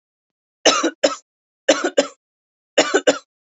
{
  "three_cough_length": "3.6 s",
  "three_cough_amplitude": 32114,
  "three_cough_signal_mean_std_ratio": 0.36,
  "survey_phase": "beta (2021-08-13 to 2022-03-07)",
  "age": "18-44",
  "gender": "Female",
  "wearing_mask": "No",
  "symptom_none": true,
  "smoker_status": "Never smoked",
  "respiratory_condition_asthma": false,
  "respiratory_condition_other": false,
  "recruitment_source": "REACT",
  "submission_delay": "3 days",
  "covid_test_result": "Negative",
  "covid_test_method": "RT-qPCR",
  "influenza_a_test_result": "Negative",
  "influenza_b_test_result": "Negative"
}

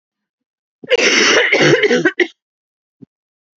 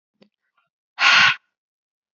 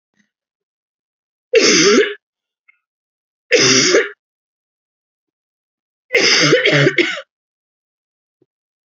{
  "cough_length": "3.6 s",
  "cough_amplitude": 31446,
  "cough_signal_mean_std_ratio": 0.51,
  "exhalation_length": "2.1 s",
  "exhalation_amplitude": 27154,
  "exhalation_signal_mean_std_ratio": 0.33,
  "three_cough_length": "9.0 s",
  "three_cough_amplitude": 32768,
  "three_cough_signal_mean_std_ratio": 0.4,
  "survey_phase": "alpha (2021-03-01 to 2021-08-12)",
  "age": "18-44",
  "gender": "Female",
  "wearing_mask": "No",
  "symptom_cough_any": true,
  "symptom_shortness_of_breath": true,
  "symptom_fatigue": true,
  "symptom_fever_high_temperature": true,
  "symptom_onset": "2 days",
  "smoker_status": "Ex-smoker",
  "respiratory_condition_asthma": false,
  "respiratory_condition_other": false,
  "recruitment_source": "Test and Trace",
  "submission_delay": "2 days",
  "covid_test_result": "Positive",
  "covid_test_method": "RT-qPCR",
  "covid_ct_value": 18.9,
  "covid_ct_gene": "ORF1ab gene",
  "covid_ct_mean": 19.5,
  "covid_viral_load": "410000 copies/ml",
  "covid_viral_load_category": "Low viral load (10K-1M copies/ml)"
}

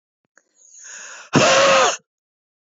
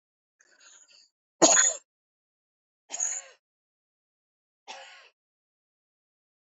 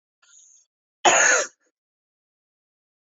{
  "exhalation_length": "2.7 s",
  "exhalation_amplitude": 29586,
  "exhalation_signal_mean_std_ratio": 0.44,
  "three_cough_length": "6.5 s",
  "three_cough_amplitude": 23928,
  "three_cough_signal_mean_std_ratio": 0.22,
  "cough_length": "3.2 s",
  "cough_amplitude": 23789,
  "cough_signal_mean_std_ratio": 0.29,
  "survey_phase": "beta (2021-08-13 to 2022-03-07)",
  "age": "45-64",
  "gender": "Female",
  "wearing_mask": "No",
  "symptom_none": true,
  "smoker_status": "Never smoked",
  "respiratory_condition_asthma": false,
  "respiratory_condition_other": false,
  "recruitment_source": "Test and Trace",
  "submission_delay": "1 day",
  "covid_test_result": "Negative",
  "covid_test_method": "RT-qPCR"
}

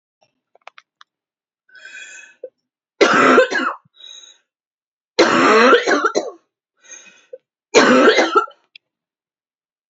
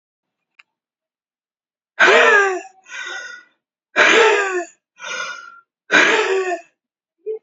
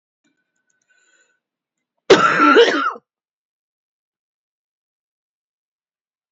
{
  "three_cough_length": "9.9 s",
  "three_cough_amplitude": 32125,
  "three_cough_signal_mean_std_ratio": 0.41,
  "exhalation_length": "7.4 s",
  "exhalation_amplitude": 32768,
  "exhalation_signal_mean_std_ratio": 0.46,
  "cough_length": "6.3 s",
  "cough_amplitude": 29039,
  "cough_signal_mean_std_ratio": 0.27,
  "survey_phase": "beta (2021-08-13 to 2022-03-07)",
  "age": "18-44",
  "gender": "Female",
  "wearing_mask": "No",
  "symptom_cough_any": true,
  "symptom_runny_or_blocked_nose": true,
  "symptom_shortness_of_breath": true,
  "symptom_sore_throat": true,
  "symptom_fatigue": true,
  "symptom_change_to_sense_of_smell_or_taste": true,
  "symptom_onset": "6 days",
  "smoker_status": "Current smoker (1 to 10 cigarettes per day)",
  "respiratory_condition_asthma": false,
  "respiratory_condition_other": false,
  "recruitment_source": "Test and Trace",
  "submission_delay": "1 day",
  "covid_test_result": "Positive",
  "covid_test_method": "RT-qPCR",
  "covid_ct_value": 25.2,
  "covid_ct_gene": "ORF1ab gene"
}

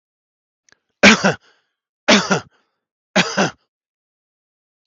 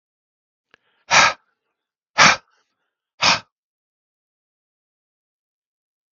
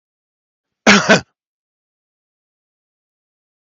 {
  "three_cough_length": "4.9 s",
  "three_cough_amplitude": 32768,
  "three_cough_signal_mean_std_ratio": 0.29,
  "exhalation_length": "6.1 s",
  "exhalation_amplitude": 32768,
  "exhalation_signal_mean_std_ratio": 0.23,
  "cough_length": "3.7 s",
  "cough_amplitude": 32768,
  "cough_signal_mean_std_ratio": 0.22,
  "survey_phase": "beta (2021-08-13 to 2022-03-07)",
  "age": "45-64",
  "gender": "Male",
  "wearing_mask": "No",
  "symptom_none": true,
  "smoker_status": "Never smoked",
  "respiratory_condition_asthma": false,
  "respiratory_condition_other": false,
  "recruitment_source": "Test and Trace",
  "submission_delay": "2 days",
  "covid_test_result": "Negative",
  "covid_test_method": "RT-qPCR"
}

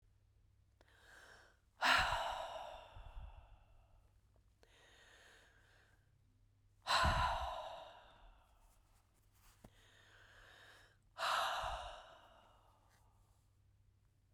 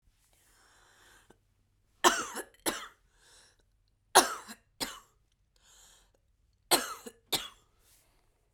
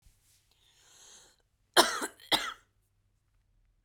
{
  "exhalation_length": "14.3 s",
  "exhalation_amplitude": 3261,
  "exhalation_signal_mean_std_ratio": 0.37,
  "three_cough_length": "8.5 s",
  "three_cough_amplitude": 23164,
  "three_cough_signal_mean_std_ratio": 0.23,
  "cough_length": "3.8 s",
  "cough_amplitude": 18723,
  "cough_signal_mean_std_ratio": 0.23,
  "survey_phase": "beta (2021-08-13 to 2022-03-07)",
  "age": "45-64",
  "gender": "Female",
  "wearing_mask": "No",
  "symptom_none": true,
  "smoker_status": "Never smoked",
  "respiratory_condition_asthma": true,
  "respiratory_condition_other": false,
  "recruitment_source": "Test and Trace",
  "submission_delay": "1 day",
  "covid_test_result": "Positive",
  "covid_test_method": "RT-qPCR",
  "covid_ct_value": 28.6,
  "covid_ct_gene": "ORF1ab gene",
  "covid_ct_mean": 29.2,
  "covid_viral_load": "270 copies/ml",
  "covid_viral_load_category": "Minimal viral load (< 10K copies/ml)"
}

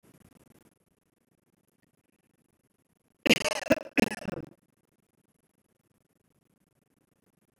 {
  "cough_length": "7.6 s",
  "cough_amplitude": 15725,
  "cough_signal_mean_std_ratio": 0.18,
  "survey_phase": "beta (2021-08-13 to 2022-03-07)",
  "age": "45-64",
  "gender": "Female",
  "wearing_mask": "No",
  "symptom_none": true,
  "smoker_status": "Never smoked",
  "respiratory_condition_asthma": false,
  "respiratory_condition_other": false,
  "recruitment_source": "REACT",
  "submission_delay": "2 days",
  "covid_test_result": "Negative",
  "covid_test_method": "RT-qPCR",
  "influenza_a_test_result": "Negative",
  "influenza_b_test_result": "Negative"
}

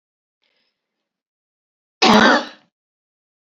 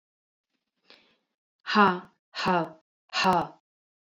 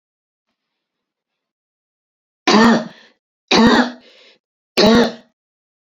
{
  "cough_length": "3.6 s",
  "cough_amplitude": 29616,
  "cough_signal_mean_std_ratio": 0.27,
  "exhalation_length": "4.1 s",
  "exhalation_amplitude": 17851,
  "exhalation_signal_mean_std_ratio": 0.36,
  "three_cough_length": "6.0 s",
  "three_cough_amplitude": 32458,
  "three_cough_signal_mean_std_ratio": 0.36,
  "survey_phase": "beta (2021-08-13 to 2022-03-07)",
  "age": "45-64",
  "gender": "Female",
  "wearing_mask": "No",
  "symptom_cough_any": true,
  "symptom_runny_or_blocked_nose": true,
  "symptom_sore_throat": true,
  "symptom_fatigue": true,
  "symptom_headache": true,
  "symptom_change_to_sense_of_smell_or_taste": true,
  "symptom_loss_of_taste": true,
  "symptom_other": true,
  "symptom_onset": "7 days",
  "smoker_status": "Never smoked",
  "respiratory_condition_asthma": false,
  "respiratory_condition_other": false,
  "recruitment_source": "Test and Trace",
  "submission_delay": "1 day",
  "covid_test_result": "Positive",
  "covid_test_method": "ePCR"
}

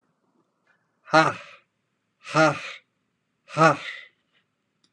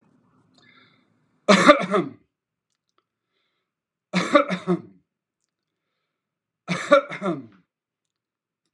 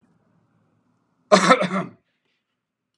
{
  "exhalation_length": "4.9 s",
  "exhalation_amplitude": 21776,
  "exhalation_signal_mean_std_ratio": 0.29,
  "three_cough_length": "8.7 s",
  "three_cough_amplitude": 32768,
  "three_cough_signal_mean_std_ratio": 0.28,
  "cough_length": "3.0 s",
  "cough_amplitude": 32636,
  "cough_signal_mean_std_ratio": 0.28,
  "survey_phase": "beta (2021-08-13 to 2022-03-07)",
  "age": "65+",
  "gender": "Male",
  "wearing_mask": "No",
  "symptom_none": true,
  "smoker_status": "Never smoked",
  "respiratory_condition_asthma": false,
  "respiratory_condition_other": false,
  "recruitment_source": "REACT",
  "submission_delay": "5 days",
  "covid_test_result": "Negative",
  "covid_test_method": "RT-qPCR",
  "influenza_a_test_result": "Negative",
  "influenza_b_test_result": "Negative"
}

